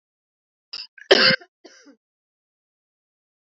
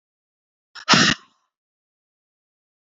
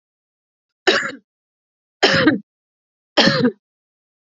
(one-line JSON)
{"cough_length": "3.5 s", "cough_amplitude": 29210, "cough_signal_mean_std_ratio": 0.22, "exhalation_length": "2.8 s", "exhalation_amplitude": 28074, "exhalation_signal_mean_std_ratio": 0.24, "three_cough_length": "4.3 s", "three_cough_amplitude": 30144, "three_cough_signal_mean_std_ratio": 0.37, "survey_phase": "alpha (2021-03-01 to 2021-08-12)", "age": "18-44", "gender": "Female", "wearing_mask": "No", "symptom_none": true, "symptom_onset": "8 days", "smoker_status": "Ex-smoker", "respiratory_condition_asthma": true, "respiratory_condition_other": false, "recruitment_source": "REACT", "submission_delay": "1 day", "covid_test_result": "Negative", "covid_test_method": "RT-qPCR"}